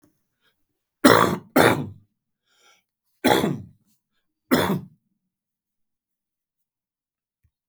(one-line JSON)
{"three_cough_length": "7.7 s", "three_cough_amplitude": 32767, "three_cough_signal_mean_std_ratio": 0.29, "survey_phase": "beta (2021-08-13 to 2022-03-07)", "age": "45-64", "gender": "Male", "wearing_mask": "No", "symptom_cough_any": true, "symptom_runny_or_blocked_nose": true, "symptom_shortness_of_breath": true, "symptom_sore_throat": true, "symptom_fatigue": true, "symptom_onset": "3 days", "smoker_status": "Never smoked", "respiratory_condition_asthma": false, "respiratory_condition_other": false, "recruitment_source": "Test and Trace", "submission_delay": "1 day", "covid_test_result": "Positive", "covid_test_method": "ePCR"}